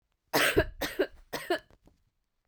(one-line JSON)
{"three_cough_length": "2.5 s", "three_cough_amplitude": 8946, "three_cough_signal_mean_std_ratio": 0.41, "survey_phase": "beta (2021-08-13 to 2022-03-07)", "age": "45-64", "gender": "Female", "wearing_mask": "No", "symptom_cough_any": true, "symptom_new_continuous_cough": true, "symptom_runny_or_blocked_nose": true, "symptom_shortness_of_breath": true, "symptom_sore_throat": true, "symptom_fatigue": true, "symptom_headache": true, "symptom_change_to_sense_of_smell_or_taste": true, "symptom_loss_of_taste": true, "symptom_onset": "3 days", "smoker_status": "Ex-smoker", "respiratory_condition_asthma": false, "respiratory_condition_other": false, "recruitment_source": "Test and Trace", "submission_delay": "1 day", "covid_test_result": "Positive", "covid_test_method": "RT-qPCR", "covid_ct_value": 28.8, "covid_ct_gene": "N gene"}